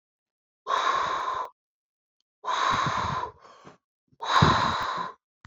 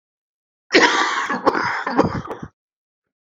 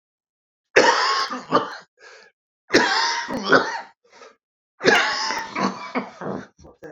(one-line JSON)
{"exhalation_length": "5.5 s", "exhalation_amplitude": 17108, "exhalation_signal_mean_std_ratio": 0.56, "cough_length": "3.3 s", "cough_amplitude": 31536, "cough_signal_mean_std_ratio": 0.5, "three_cough_length": "6.9 s", "three_cough_amplitude": 32767, "three_cough_signal_mean_std_ratio": 0.5, "survey_phase": "beta (2021-08-13 to 2022-03-07)", "age": "45-64", "gender": "Male", "wearing_mask": "No", "symptom_cough_any": true, "symptom_new_continuous_cough": true, "symptom_runny_or_blocked_nose": true, "symptom_sore_throat": true, "symptom_abdominal_pain": true, "symptom_diarrhoea": true, "symptom_fatigue": true, "symptom_headache": true, "symptom_change_to_sense_of_smell_or_taste": true, "symptom_onset": "6 days", "smoker_status": "Ex-smoker", "respiratory_condition_asthma": false, "respiratory_condition_other": false, "recruitment_source": "Test and Trace", "submission_delay": "2 days", "covid_test_result": "Positive", "covid_test_method": "RT-qPCR", "covid_ct_value": 14.9, "covid_ct_gene": "ORF1ab gene", "covid_ct_mean": 15.3, "covid_viral_load": "9700000 copies/ml", "covid_viral_load_category": "High viral load (>1M copies/ml)"}